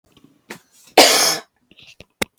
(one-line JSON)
{"cough_length": "2.4 s", "cough_amplitude": 32768, "cough_signal_mean_std_ratio": 0.33, "survey_phase": "beta (2021-08-13 to 2022-03-07)", "age": "18-44", "gender": "Female", "wearing_mask": "No", "symptom_cough_any": true, "symptom_runny_or_blocked_nose": true, "symptom_shortness_of_breath": true, "symptom_fatigue": true, "symptom_headache": true, "symptom_onset": "10 days", "smoker_status": "Ex-smoker", "respiratory_condition_asthma": false, "respiratory_condition_other": false, "recruitment_source": "Test and Trace", "submission_delay": "3 days", "covid_test_result": "Positive", "covid_test_method": "RT-qPCR", "covid_ct_value": 23.1, "covid_ct_gene": "ORF1ab gene", "covid_ct_mean": 23.8, "covid_viral_load": "16000 copies/ml", "covid_viral_load_category": "Low viral load (10K-1M copies/ml)"}